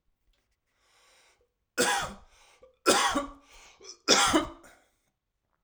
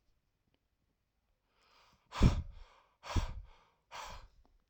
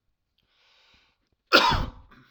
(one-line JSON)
{"three_cough_length": "5.6 s", "three_cough_amplitude": 20872, "three_cough_signal_mean_std_ratio": 0.36, "exhalation_length": "4.7 s", "exhalation_amplitude": 6575, "exhalation_signal_mean_std_ratio": 0.26, "cough_length": "2.3 s", "cough_amplitude": 32767, "cough_signal_mean_std_ratio": 0.29, "survey_phase": "alpha (2021-03-01 to 2021-08-12)", "age": "45-64", "gender": "Male", "wearing_mask": "No", "symptom_none": true, "smoker_status": "Never smoked", "respiratory_condition_asthma": false, "respiratory_condition_other": false, "recruitment_source": "REACT", "submission_delay": "1 day", "covid_test_result": "Negative", "covid_test_method": "RT-qPCR"}